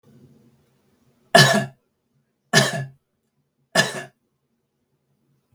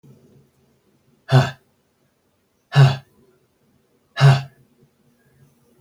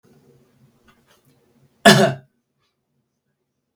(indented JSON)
{
  "three_cough_length": "5.5 s",
  "three_cough_amplitude": 32768,
  "three_cough_signal_mean_std_ratio": 0.27,
  "exhalation_length": "5.8 s",
  "exhalation_amplitude": 28925,
  "exhalation_signal_mean_std_ratio": 0.27,
  "cough_length": "3.8 s",
  "cough_amplitude": 32768,
  "cough_signal_mean_std_ratio": 0.21,
  "survey_phase": "beta (2021-08-13 to 2022-03-07)",
  "age": "45-64",
  "gender": "Male",
  "wearing_mask": "No",
  "symptom_runny_or_blocked_nose": true,
  "smoker_status": "Never smoked",
  "respiratory_condition_asthma": false,
  "respiratory_condition_other": false,
  "recruitment_source": "REACT",
  "submission_delay": "2 days",
  "covid_test_result": "Negative",
  "covid_test_method": "RT-qPCR",
  "influenza_a_test_result": "Negative",
  "influenza_b_test_result": "Negative"
}